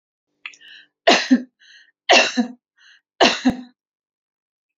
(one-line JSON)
{"three_cough_length": "4.8 s", "three_cough_amplitude": 29834, "three_cough_signal_mean_std_ratio": 0.33, "survey_phase": "alpha (2021-03-01 to 2021-08-12)", "age": "45-64", "gender": "Female", "wearing_mask": "No", "symptom_none": true, "smoker_status": "Ex-smoker", "respiratory_condition_asthma": false, "respiratory_condition_other": false, "recruitment_source": "REACT", "submission_delay": "1 day", "covid_test_result": "Negative", "covid_test_method": "RT-qPCR"}